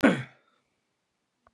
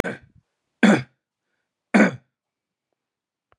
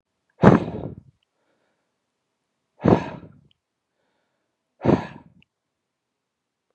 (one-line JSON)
{"cough_length": "1.5 s", "cough_amplitude": 20218, "cough_signal_mean_std_ratio": 0.25, "three_cough_length": "3.6 s", "three_cough_amplitude": 24401, "three_cough_signal_mean_std_ratio": 0.27, "exhalation_length": "6.7 s", "exhalation_amplitude": 32768, "exhalation_signal_mean_std_ratio": 0.22, "survey_phase": "beta (2021-08-13 to 2022-03-07)", "age": "18-44", "gender": "Male", "wearing_mask": "No", "symptom_none": true, "smoker_status": "Current smoker (e-cigarettes or vapes only)", "respiratory_condition_asthma": false, "respiratory_condition_other": false, "recruitment_source": "REACT", "submission_delay": "3 days", "covid_test_result": "Negative", "covid_test_method": "RT-qPCR", "influenza_a_test_result": "Negative", "influenza_b_test_result": "Negative"}